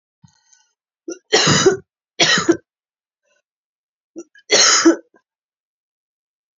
{"three_cough_length": "6.6 s", "three_cough_amplitude": 32303, "three_cough_signal_mean_std_ratio": 0.35, "survey_phase": "beta (2021-08-13 to 2022-03-07)", "age": "45-64", "gender": "Female", "wearing_mask": "No", "symptom_cough_any": true, "symptom_runny_or_blocked_nose": true, "symptom_sore_throat": true, "symptom_abdominal_pain": true, "symptom_fatigue": true, "symptom_fever_high_temperature": true, "symptom_headache": true, "symptom_onset": "5 days", "smoker_status": "Never smoked", "respiratory_condition_asthma": false, "respiratory_condition_other": false, "recruitment_source": "Test and Trace", "submission_delay": "2 days", "covid_test_result": "Positive", "covid_test_method": "ePCR"}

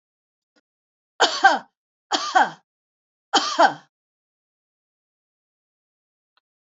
{"three_cough_length": "6.7 s", "three_cough_amplitude": 27208, "three_cough_signal_mean_std_ratio": 0.27, "survey_phase": "beta (2021-08-13 to 2022-03-07)", "age": "65+", "gender": "Female", "wearing_mask": "No", "symptom_headache": true, "smoker_status": "Never smoked", "respiratory_condition_asthma": false, "respiratory_condition_other": false, "recruitment_source": "REACT", "submission_delay": "1 day", "covid_test_result": "Negative", "covid_test_method": "RT-qPCR", "influenza_a_test_result": "Negative", "influenza_b_test_result": "Negative"}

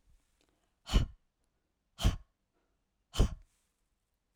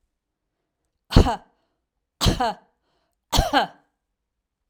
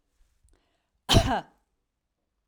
{"exhalation_length": "4.4 s", "exhalation_amplitude": 7984, "exhalation_signal_mean_std_ratio": 0.24, "three_cough_length": "4.7 s", "three_cough_amplitude": 32768, "three_cough_signal_mean_std_ratio": 0.29, "cough_length": "2.5 s", "cough_amplitude": 13777, "cough_signal_mean_std_ratio": 0.26, "survey_phase": "alpha (2021-03-01 to 2021-08-12)", "age": "45-64", "gender": "Female", "wearing_mask": "No", "symptom_none": true, "smoker_status": "Ex-smoker", "respiratory_condition_asthma": false, "respiratory_condition_other": false, "recruitment_source": "REACT", "submission_delay": "1 day", "covid_test_result": "Negative", "covid_test_method": "RT-qPCR"}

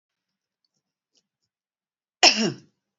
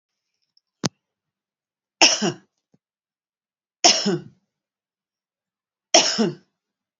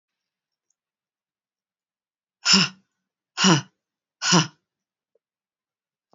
{"cough_length": "3.0 s", "cough_amplitude": 28043, "cough_signal_mean_std_ratio": 0.21, "three_cough_length": "7.0 s", "three_cough_amplitude": 32768, "three_cough_signal_mean_std_ratio": 0.27, "exhalation_length": "6.1 s", "exhalation_amplitude": 27960, "exhalation_signal_mean_std_ratio": 0.25, "survey_phase": "beta (2021-08-13 to 2022-03-07)", "age": "45-64", "gender": "Female", "wearing_mask": "No", "symptom_none": true, "smoker_status": "Current smoker (1 to 10 cigarettes per day)", "respiratory_condition_asthma": false, "respiratory_condition_other": false, "recruitment_source": "REACT", "submission_delay": "1 day", "covid_test_result": "Negative", "covid_test_method": "RT-qPCR", "influenza_a_test_result": "Negative", "influenza_b_test_result": "Negative"}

